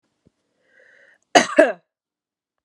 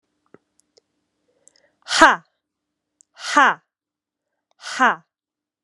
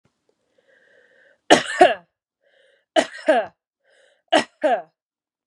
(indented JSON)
{
  "cough_length": "2.6 s",
  "cough_amplitude": 32768,
  "cough_signal_mean_std_ratio": 0.23,
  "exhalation_length": "5.6 s",
  "exhalation_amplitude": 32768,
  "exhalation_signal_mean_std_ratio": 0.24,
  "three_cough_length": "5.5 s",
  "three_cough_amplitude": 32768,
  "three_cough_signal_mean_std_ratio": 0.29,
  "survey_phase": "beta (2021-08-13 to 2022-03-07)",
  "age": "18-44",
  "gender": "Female",
  "wearing_mask": "No",
  "symptom_runny_or_blocked_nose": true,
  "symptom_headache": true,
  "symptom_onset": "5 days",
  "smoker_status": "Never smoked",
  "respiratory_condition_asthma": false,
  "respiratory_condition_other": false,
  "recruitment_source": "REACT",
  "submission_delay": "2 days",
  "covid_test_result": "Negative",
  "covid_test_method": "RT-qPCR"
}